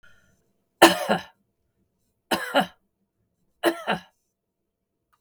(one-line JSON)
{"three_cough_length": "5.2 s", "three_cough_amplitude": 32767, "three_cough_signal_mean_std_ratio": 0.26, "survey_phase": "beta (2021-08-13 to 2022-03-07)", "age": "65+", "gender": "Female", "wearing_mask": "No", "symptom_none": true, "smoker_status": "Ex-smoker", "respiratory_condition_asthma": false, "respiratory_condition_other": false, "recruitment_source": "REACT", "submission_delay": "1 day", "covid_test_result": "Negative", "covid_test_method": "RT-qPCR", "influenza_a_test_result": "Negative", "influenza_b_test_result": "Negative"}